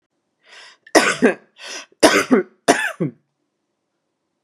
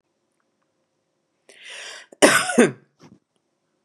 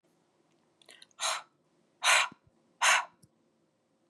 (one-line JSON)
{"three_cough_length": "4.4 s", "three_cough_amplitude": 32768, "three_cough_signal_mean_std_ratio": 0.35, "cough_length": "3.8 s", "cough_amplitude": 32067, "cough_signal_mean_std_ratio": 0.26, "exhalation_length": "4.1 s", "exhalation_amplitude": 8963, "exhalation_signal_mean_std_ratio": 0.31, "survey_phase": "beta (2021-08-13 to 2022-03-07)", "age": "45-64", "gender": "Female", "wearing_mask": "No", "symptom_sore_throat": true, "smoker_status": "Never smoked", "respiratory_condition_asthma": false, "respiratory_condition_other": false, "recruitment_source": "REACT", "submission_delay": "4 days", "covid_test_result": "Negative", "covid_test_method": "RT-qPCR", "influenza_a_test_result": "Negative", "influenza_b_test_result": "Negative"}